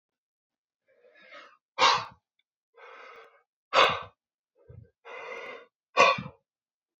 exhalation_length: 7.0 s
exhalation_amplitude: 17734
exhalation_signal_mean_std_ratio: 0.28
survey_phase: beta (2021-08-13 to 2022-03-07)
age: 18-44
gender: Male
wearing_mask: 'No'
symptom_none: true
smoker_status: Never smoked
respiratory_condition_asthma: false
respiratory_condition_other: false
recruitment_source: REACT
submission_delay: 5 days
covid_test_result: Negative
covid_test_method: RT-qPCR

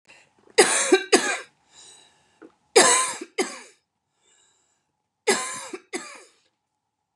three_cough_length: 7.2 s
three_cough_amplitude: 27130
three_cough_signal_mean_std_ratio: 0.34
survey_phase: beta (2021-08-13 to 2022-03-07)
age: 45-64
gender: Female
wearing_mask: 'No'
symptom_none: true
smoker_status: Never smoked
respiratory_condition_asthma: false
respiratory_condition_other: false
recruitment_source: REACT
submission_delay: 2 days
covid_test_result: Negative
covid_test_method: RT-qPCR
influenza_a_test_result: Negative
influenza_b_test_result: Negative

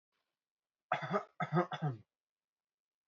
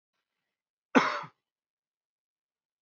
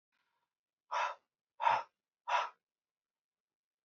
three_cough_length: 3.1 s
three_cough_amplitude: 4496
three_cough_signal_mean_std_ratio: 0.35
cough_length: 2.8 s
cough_amplitude: 17323
cough_signal_mean_std_ratio: 0.19
exhalation_length: 3.8 s
exhalation_amplitude: 4322
exhalation_signal_mean_std_ratio: 0.31
survey_phase: beta (2021-08-13 to 2022-03-07)
age: 18-44
gender: Male
wearing_mask: 'No'
symptom_none: true
smoker_status: Never smoked
respiratory_condition_asthma: false
respiratory_condition_other: false
recruitment_source: Test and Trace
submission_delay: 1 day
covid_test_result: Negative
covid_test_method: RT-qPCR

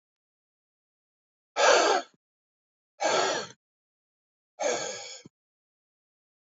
exhalation_length: 6.5 s
exhalation_amplitude: 13904
exhalation_signal_mean_std_ratio: 0.34
survey_phase: beta (2021-08-13 to 2022-03-07)
age: 45-64
gender: Male
wearing_mask: 'No'
symptom_cough_any: true
symptom_runny_or_blocked_nose: true
symptom_shortness_of_breath: true
symptom_sore_throat: true
symptom_fatigue: true
symptom_onset: 2 days
smoker_status: Never smoked
respiratory_condition_asthma: false
respiratory_condition_other: false
recruitment_source: Test and Trace
submission_delay: 1 day
covid_test_result: Positive
covid_test_method: ePCR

